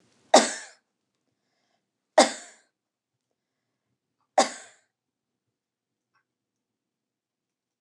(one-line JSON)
{"three_cough_length": "7.8 s", "three_cough_amplitude": 25332, "three_cough_signal_mean_std_ratio": 0.16, "survey_phase": "beta (2021-08-13 to 2022-03-07)", "age": "65+", "gender": "Female", "wearing_mask": "No", "symptom_abdominal_pain": true, "symptom_onset": "12 days", "smoker_status": "Ex-smoker", "respiratory_condition_asthma": false, "respiratory_condition_other": false, "recruitment_source": "REACT", "submission_delay": "2 days", "covid_test_result": "Negative", "covid_test_method": "RT-qPCR", "influenza_a_test_result": "Negative", "influenza_b_test_result": "Negative"}